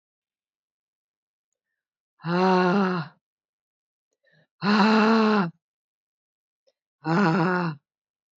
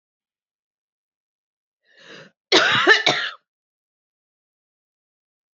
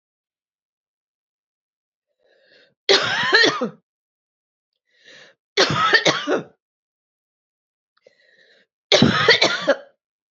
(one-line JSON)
{"exhalation_length": "8.4 s", "exhalation_amplitude": 15342, "exhalation_signal_mean_std_ratio": 0.43, "cough_length": "5.5 s", "cough_amplitude": 29066, "cough_signal_mean_std_ratio": 0.27, "three_cough_length": "10.3 s", "three_cough_amplitude": 32518, "three_cough_signal_mean_std_ratio": 0.36, "survey_phase": "beta (2021-08-13 to 2022-03-07)", "age": "45-64", "gender": "Female", "wearing_mask": "No", "symptom_cough_any": true, "symptom_runny_or_blocked_nose": true, "symptom_sore_throat": true, "symptom_abdominal_pain": true, "symptom_fatigue": true, "symptom_fever_high_temperature": true, "symptom_headache": true, "symptom_onset": "2 days", "smoker_status": "Current smoker (1 to 10 cigarettes per day)", "respiratory_condition_asthma": false, "respiratory_condition_other": false, "recruitment_source": "Test and Trace", "submission_delay": "2 days", "covid_test_result": "Positive", "covid_test_method": "RT-qPCR", "covid_ct_value": 22.7, "covid_ct_gene": "ORF1ab gene", "covid_ct_mean": 22.9, "covid_viral_load": "30000 copies/ml", "covid_viral_load_category": "Low viral load (10K-1M copies/ml)"}